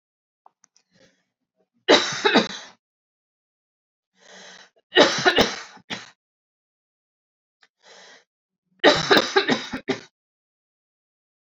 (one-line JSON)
{"three_cough_length": "11.5 s", "three_cough_amplitude": 30829, "three_cough_signal_mean_std_ratio": 0.29, "survey_phase": "alpha (2021-03-01 to 2021-08-12)", "age": "45-64", "gender": "Female", "wearing_mask": "No", "symptom_none": true, "smoker_status": "Never smoked", "respiratory_condition_asthma": false, "respiratory_condition_other": false, "recruitment_source": "REACT", "submission_delay": "1 day", "covid_test_result": "Negative", "covid_test_method": "RT-qPCR"}